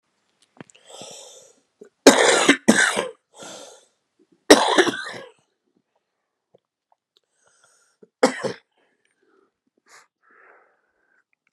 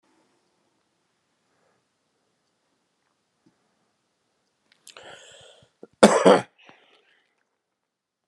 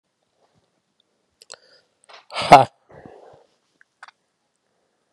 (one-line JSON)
{"three_cough_length": "11.5 s", "three_cough_amplitude": 32768, "three_cough_signal_mean_std_ratio": 0.26, "cough_length": "8.3 s", "cough_amplitude": 32767, "cough_signal_mean_std_ratio": 0.16, "exhalation_length": "5.1 s", "exhalation_amplitude": 32768, "exhalation_signal_mean_std_ratio": 0.15, "survey_phase": "beta (2021-08-13 to 2022-03-07)", "age": "65+", "gender": "Male", "wearing_mask": "No", "symptom_cough_any": true, "symptom_sore_throat": true, "symptom_fatigue": true, "symptom_headache": true, "symptom_loss_of_taste": true, "smoker_status": "Ex-smoker", "respiratory_condition_asthma": false, "respiratory_condition_other": false, "recruitment_source": "Test and Trace", "submission_delay": "1 day", "covid_test_result": "Positive", "covid_test_method": "RT-qPCR", "covid_ct_value": 22.5, "covid_ct_gene": "ORF1ab gene", "covid_ct_mean": 23.3, "covid_viral_load": "23000 copies/ml", "covid_viral_load_category": "Low viral load (10K-1M copies/ml)"}